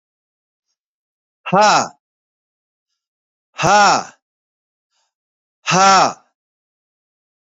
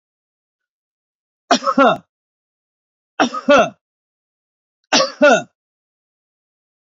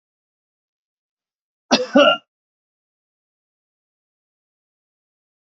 {"exhalation_length": "7.4 s", "exhalation_amplitude": 32347, "exhalation_signal_mean_std_ratio": 0.33, "three_cough_length": "6.9 s", "three_cough_amplitude": 29845, "three_cough_signal_mean_std_ratio": 0.31, "cough_length": "5.5 s", "cough_amplitude": 27907, "cough_signal_mean_std_ratio": 0.19, "survey_phase": "beta (2021-08-13 to 2022-03-07)", "age": "45-64", "gender": "Male", "wearing_mask": "No", "symptom_none": true, "smoker_status": "Never smoked", "respiratory_condition_asthma": false, "respiratory_condition_other": false, "recruitment_source": "REACT", "submission_delay": "2 days", "covid_test_result": "Negative", "covid_test_method": "RT-qPCR", "influenza_a_test_result": "Negative", "influenza_b_test_result": "Negative"}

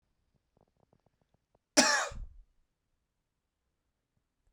{"cough_length": "4.5 s", "cough_amplitude": 15900, "cough_signal_mean_std_ratio": 0.21, "survey_phase": "beta (2021-08-13 to 2022-03-07)", "age": "18-44", "gender": "Male", "wearing_mask": "No", "symptom_cough_any": true, "symptom_runny_or_blocked_nose": true, "symptom_fatigue": true, "symptom_change_to_sense_of_smell_or_taste": true, "symptom_onset": "5 days", "smoker_status": "Never smoked", "respiratory_condition_asthma": false, "respiratory_condition_other": false, "recruitment_source": "Test and Trace", "submission_delay": "2 days", "covid_test_result": "Positive", "covid_test_method": "LAMP"}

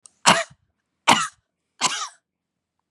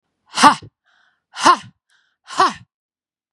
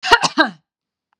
{"three_cough_length": "2.9 s", "three_cough_amplitude": 32629, "three_cough_signal_mean_std_ratio": 0.3, "exhalation_length": "3.3 s", "exhalation_amplitude": 32768, "exhalation_signal_mean_std_ratio": 0.29, "cough_length": "1.2 s", "cough_amplitude": 32768, "cough_signal_mean_std_ratio": 0.37, "survey_phase": "beta (2021-08-13 to 2022-03-07)", "age": "45-64", "gender": "Female", "wearing_mask": "No", "symptom_none": true, "smoker_status": "Never smoked", "respiratory_condition_asthma": false, "respiratory_condition_other": false, "recruitment_source": "REACT", "submission_delay": "4 days", "covid_test_result": "Negative", "covid_test_method": "RT-qPCR", "influenza_a_test_result": "Negative", "influenza_b_test_result": "Negative"}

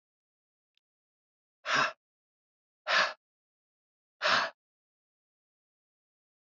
{"exhalation_length": "6.6 s", "exhalation_amplitude": 7706, "exhalation_signal_mean_std_ratio": 0.26, "survey_phase": "beta (2021-08-13 to 2022-03-07)", "age": "18-44", "gender": "Male", "wearing_mask": "No", "symptom_cough_any": true, "symptom_runny_or_blocked_nose": true, "symptom_shortness_of_breath": true, "symptom_fatigue": true, "symptom_headache": true, "symptom_change_to_sense_of_smell_or_taste": true, "symptom_loss_of_taste": true, "symptom_other": true, "symptom_onset": "6 days", "smoker_status": "Ex-smoker", "respiratory_condition_asthma": false, "respiratory_condition_other": false, "recruitment_source": "Test and Trace", "submission_delay": "2 days", "covid_test_result": "Positive", "covid_test_method": "RT-qPCR"}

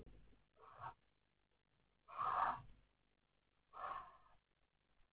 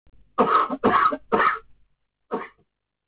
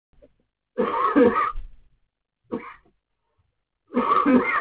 {"exhalation_length": "5.1 s", "exhalation_amplitude": 1586, "exhalation_signal_mean_std_ratio": 0.35, "cough_length": "3.1 s", "cough_amplitude": 16812, "cough_signal_mean_std_ratio": 0.49, "three_cough_length": "4.6 s", "three_cough_amplitude": 17842, "three_cough_signal_mean_std_ratio": 0.48, "survey_phase": "beta (2021-08-13 to 2022-03-07)", "age": "18-44", "gender": "Male", "wearing_mask": "No", "symptom_new_continuous_cough": true, "symptom_shortness_of_breath": true, "symptom_sore_throat": true, "symptom_fatigue": true, "symptom_onset": "3 days", "smoker_status": "Current smoker (1 to 10 cigarettes per day)", "respiratory_condition_asthma": false, "respiratory_condition_other": false, "recruitment_source": "Test and Trace", "submission_delay": "1 day", "covid_test_result": "Positive", "covid_test_method": "RT-qPCR"}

